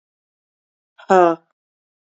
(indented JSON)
{
  "exhalation_length": "2.1 s",
  "exhalation_amplitude": 29081,
  "exhalation_signal_mean_std_ratio": 0.24,
  "survey_phase": "beta (2021-08-13 to 2022-03-07)",
  "age": "45-64",
  "gender": "Female",
  "wearing_mask": "No",
  "symptom_cough_any": true,
  "symptom_runny_or_blocked_nose": true,
  "symptom_shortness_of_breath": true,
  "symptom_abdominal_pain": true,
  "symptom_fatigue": true,
  "symptom_onset": "3 days",
  "smoker_status": "Never smoked",
  "respiratory_condition_asthma": true,
  "respiratory_condition_other": false,
  "recruitment_source": "Test and Trace",
  "submission_delay": "2 days",
  "covid_test_result": "Positive",
  "covid_test_method": "RT-qPCR",
  "covid_ct_value": 24.6,
  "covid_ct_gene": "N gene",
  "covid_ct_mean": 24.7,
  "covid_viral_load": "7800 copies/ml",
  "covid_viral_load_category": "Minimal viral load (< 10K copies/ml)"
}